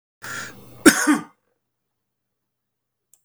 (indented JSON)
{
  "cough_length": "3.2 s",
  "cough_amplitude": 32768,
  "cough_signal_mean_std_ratio": 0.25,
  "survey_phase": "beta (2021-08-13 to 2022-03-07)",
  "age": "65+",
  "gender": "Male",
  "wearing_mask": "No",
  "symptom_none": true,
  "smoker_status": "Ex-smoker",
  "respiratory_condition_asthma": false,
  "respiratory_condition_other": false,
  "recruitment_source": "REACT",
  "submission_delay": "1 day",
  "covid_test_result": "Negative",
  "covid_test_method": "RT-qPCR",
  "influenza_a_test_result": "Negative",
  "influenza_b_test_result": "Negative"
}